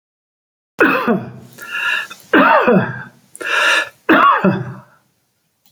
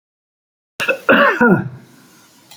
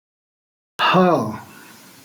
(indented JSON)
{
  "three_cough_length": "5.7 s",
  "three_cough_amplitude": 32768,
  "three_cough_signal_mean_std_ratio": 0.55,
  "cough_length": "2.6 s",
  "cough_amplitude": 32767,
  "cough_signal_mean_std_ratio": 0.44,
  "exhalation_length": "2.0 s",
  "exhalation_amplitude": 22997,
  "exhalation_signal_mean_std_ratio": 0.43,
  "survey_phase": "beta (2021-08-13 to 2022-03-07)",
  "age": "65+",
  "gender": "Male",
  "wearing_mask": "No",
  "symptom_none": true,
  "smoker_status": "Ex-smoker",
  "respiratory_condition_asthma": false,
  "respiratory_condition_other": false,
  "recruitment_source": "REACT",
  "submission_delay": "2 days",
  "covid_test_result": "Negative",
  "covid_test_method": "RT-qPCR"
}